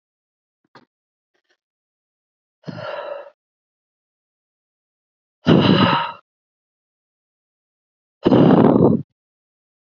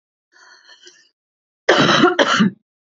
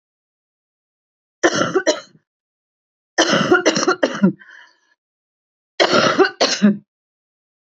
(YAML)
exhalation_length: 9.8 s
exhalation_amplitude: 30938
exhalation_signal_mean_std_ratio: 0.31
cough_length: 2.8 s
cough_amplitude: 28854
cough_signal_mean_std_ratio: 0.44
three_cough_length: 7.8 s
three_cough_amplitude: 30991
three_cough_signal_mean_std_ratio: 0.42
survey_phase: beta (2021-08-13 to 2022-03-07)
age: 45-64
gender: Female
wearing_mask: 'No'
symptom_cough_any: true
symptom_runny_or_blocked_nose: true
symptom_sore_throat: true
symptom_fatigue: true
symptom_headache: true
symptom_other: true
symptom_onset: 5 days
smoker_status: Ex-smoker
respiratory_condition_asthma: true
respiratory_condition_other: false
recruitment_source: REACT
submission_delay: 4 days
covid_test_result: Negative
covid_test_method: RT-qPCR
influenza_a_test_result: Negative
influenza_b_test_result: Negative